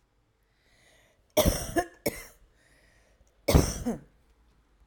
{"cough_length": "4.9 s", "cough_amplitude": 19807, "cough_signal_mean_std_ratio": 0.31, "survey_phase": "alpha (2021-03-01 to 2021-08-12)", "age": "18-44", "gender": "Female", "wearing_mask": "No", "symptom_none": true, "smoker_status": "Never smoked", "respiratory_condition_asthma": false, "respiratory_condition_other": false, "recruitment_source": "REACT", "submission_delay": "1 day", "covid_test_result": "Negative", "covid_test_method": "RT-qPCR"}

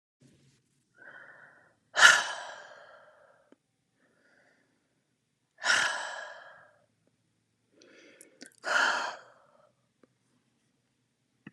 {"exhalation_length": "11.5 s", "exhalation_amplitude": 25526, "exhalation_signal_mean_std_ratio": 0.25, "survey_phase": "alpha (2021-03-01 to 2021-08-12)", "age": "45-64", "gender": "Female", "wearing_mask": "No", "symptom_none": true, "symptom_onset": "12 days", "smoker_status": "Never smoked", "respiratory_condition_asthma": false, "respiratory_condition_other": false, "recruitment_source": "REACT", "submission_delay": "2 days", "covid_test_result": "Negative", "covid_test_method": "RT-qPCR"}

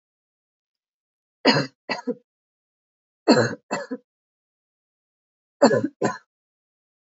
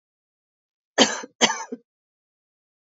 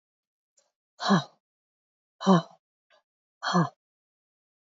{"three_cough_length": "7.2 s", "three_cough_amplitude": 25607, "three_cough_signal_mean_std_ratio": 0.27, "cough_length": "3.0 s", "cough_amplitude": 25864, "cough_signal_mean_std_ratio": 0.24, "exhalation_length": "4.8 s", "exhalation_amplitude": 15388, "exhalation_signal_mean_std_ratio": 0.26, "survey_phase": "alpha (2021-03-01 to 2021-08-12)", "age": "18-44", "gender": "Female", "wearing_mask": "No", "symptom_shortness_of_breath": true, "symptom_fatigue": true, "symptom_change_to_sense_of_smell_or_taste": true, "symptom_loss_of_taste": true, "symptom_onset": "5 days", "smoker_status": "Never smoked", "respiratory_condition_asthma": false, "respiratory_condition_other": false, "recruitment_source": "Test and Trace", "submission_delay": "2 days", "covid_test_result": "Positive", "covid_test_method": "RT-qPCR"}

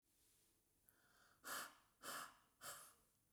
{"exhalation_length": "3.3 s", "exhalation_amplitude": 408, "exhalation_signal_mean_std_ratio": 0.46, "survey_phase": "beta (2021-08-13 to 2022-03-07)", "age": "45-64", "gender": "Female", "wearing_mask": "No", "symptom_none": true, "smoker_status": "Never smoked", "respiratory_condition_asthma": false, "respiratory_condition_other": false, "recruitment_source": "REACT", "submission_delay": "1 day", "covid_test_result": "Negative", "covid_test_method": "RT-qPCR", "influenza_a_test_result": "Negative", "influenza_b_test_result": "Negative"}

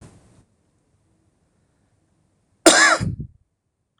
{"cough_length": "4.0 s", "cough_amplitude": 26028, "cough_signal_mean_std_ratio": 0.26, "survey_phase": "beta (2021-08-13 to 2022-03-07)", "age": "45-64", "gender": "Male", "wearing_mask": "No", "symptom_cough_any": true, "symptom_runny_or_blocked_nose": true, "symptom_sore_throat": true, "symptom_fatigue": true, "symptom_onset": "10 days", "smoker_status": "Never smoked", "respiratory_condition_asthma": false, "respiratory_condition_other": false, "recruitment_source": "REACT", "submission_delay": "10 days", "covid_test_result": "Negative", "covid_test_method": "RT-qPCR", "influenza_a_test_result": "Negative", "influenza_b_test_result": "Negative"}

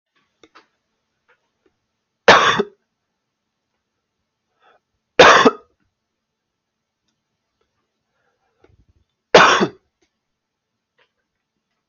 {"three_cough_length": "11.9 s", "three_cough_amplitude": 32768, "three_cough_signal_mean_std_ratio": 0.22, "survey_phase": "beta (2021-08-13 to 2022-03-07)", "age": "18-44", "gender": "Male", "wearing_mask": "No", "symptom_none": true, "smoker_status": "Never smoked", "respiratory_condition_asthma": false, "respiratory_condition_other": false, "recruitment_source": "REACT", "submission_delay": "3 days", "covid_test_result": "Negative", "covid_test_method": "RT-qPCR", "influenza_a_test_result": "Negative", "influenza_b_test_result": "Negative"}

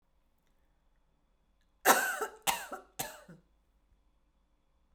{"three_cough_length": "4.9 s", "three_cough_amplitude": 11159, "three_cough_signal_mean_std_ratio": 0.26, "survey_phase": "beta (2021-08-13 to 2022-03-07)", "age": "18-44", "gender": "Female", "wearing_mask": "No", "symptom_none": true, "smoker_status": "Never smoked", "respiratory_condition_asthma": false, "respiratory_condition_other": false, "recruitment_source": "REACT", "submission_delay": "1 day", "covid_test_result": "Negative", "covid_test_method": "RT-qPCR"}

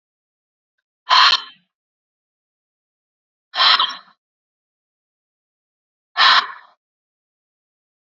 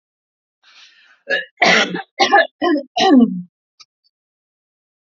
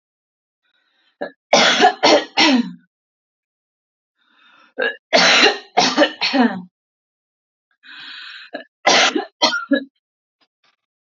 {"exhalation_length": "8.0 s", "exhalation_amplitude": 31606, "exhalation_signal_mean_std_ratio": 0.27, "cough_length": "5.0 s", "cough_amplitude": 31702, "cough_signal_mean_std_ratio": 0.42, "three_cough_length": "11.2 s", "three_cough_amplitude": 32767, "three_cough_signal_mean_std_ratio": 0.41, "survey_phase": "alpha (2021-03-01 to 2021-08-12)", "age": "18-44", "gender": "Female", "wearing_mask": "No", "symptom_none": true, "smoker_status": "Never smoked", "respiratory_condition_asthma": true, "respiratory_condition_other": false, "recruitment_source": "REACT", "submission_delay": "2 days", "covid_test_result": "Negative", "covid_test_method": "RT-qPCR"}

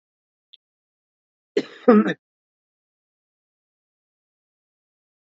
{"cough_length": "5.2 s", "cough_amplitude": 25016, "cough_signal_mean_std_ratio": 0.18, "survey_phase": "beta (2021-08-13 to 2022-03-07)", "age": "45-64", "gender": "Female", "wearing_mask": "No", "symptom_none": true, "symptom_onset": "8 days", "smoker_status": "Ex-smoker", "respiratory_condition_asthma": false, "respiratory_condition_other": false, "recruitment_source": "REACT", "submission_delay": "1 day", "covid_test_result": "Negative", "covid_test_method": "RT-qPCR"}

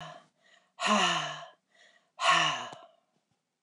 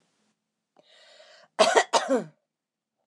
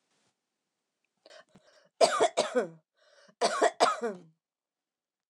{"exhalation_length": "3.6 s", "exhalation_amplitude": 7394, "exhalation_signal_mean_std_ratio": 0.44, "cough_length": "3.1 s", "cough_amplitude": 23590, "cough_signal_mean_std_ratio": 0.31, "three_cough_length": "5.3 s", "three_cough_amplitude": 12731, "three_cough_signal_mean_std_ratio": 0.34, "survey_phase": "beta (2021-08-13 to 2022-03-07)", "age": "65+", "gender": "Female", "wearing_mask": "No", "symptom_none": true, "smoker_status": "Ex-smoker", "respiratory_condition_asthma": false, "respiratory_condition_other": false, "recruitment_source": "REACT", "submission_delay": "10 days", "covid_test_result": "Negative", "covid_test_method": "RT-qPCR"}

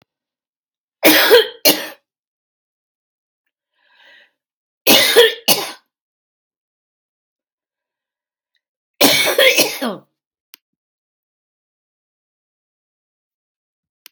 {"three_cough_length": "14.1 s", "three_cough_amplitude": 32768, "three_cough_signal_mean_std_ratio": 0.29, "survey_phase": "beta (2021-08-13 to 2022-03-07)", "age": "65+", "gender": "Female", "wearing_mask": "No", "symptom_cough_any": true, "symptom_shortness_of_breath": true, "symptom_headache": true, "symptom_onset": "12 days", "smoker_status": "Never smoked", "respiratory_condition_asthma": false, "respiratory_condition_other": true, "recruitment_source": "REACT", "submission_delay": "1 day", "covid_test_result": "Negative", "covid_test_method": "RT-qPCR", "influenza_a_test_result": "Negative", "influenza_b_test_result": "Negative"}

